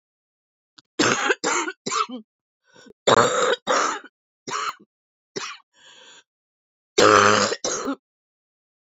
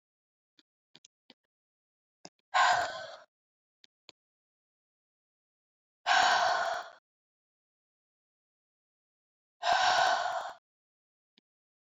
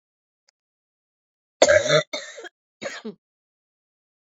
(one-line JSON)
{"three_cough_length": "9.0 s", "three_cough_amplitude": 26849, "three_cough_signal_mean_std_ratio": 0.41, "exhalation_length": "11.9 s", "exhalation_amplitude": 7357, "exhalation_signal_mean_std_ratio": 0.33, "cough_length": "4.4 s", "cough_amplitude": 26550, "cough_signal_mean_std_ratio": 0.26, "survey_phase": "beta (2021-08-13 to 2022-03-07)", "age": "45-64", "gender": "Female", "wearing_mask": "No", "symptom_cough_any": true, "symptom_sore_throat": true, "symptom_change_to_sense_of_smell_or_taste": true, "symptom_onset": "3 days", "smoker_status": "Never smoked", "respiratory_condition_asthma": false, "respiratory_condition_other": false, "recruitment_source": "Test and Trace", "submission_delay": "1 day", "covid_test_result": "Positive", "covid_test_method": "RT-qPCR", "covid_ct_value": 15.9, "covid_ct_gene": "ORF1ab gene", "covid_ct_mean": 16.3, "covid_viral_load": "4500000 copies/ml", "covid_viral_load_category": "High viral load (>1M copies/ml)"}